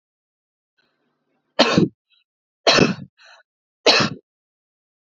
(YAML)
three_cough_length: 5.1 s
three_cough_amplitude: 32767
three_cough_signal_mean_std_ratio: 0.3
survey_phase: beta (2021-08-13 to 2022-03-07)
age: 45-64
gender: Female
wearing_mask: 'No'
symptom_none: true
smoker_status: Ex-smoker
respiratory_condition_asthma: false
respiratory_condition_other: false
recruitment_source: REACT
submission_delay: 2 days
covid_test_result: Negative
covid_test_method: RT-qPCR
influenza_a_test_result: Negative
influenza_b_test_result: Negative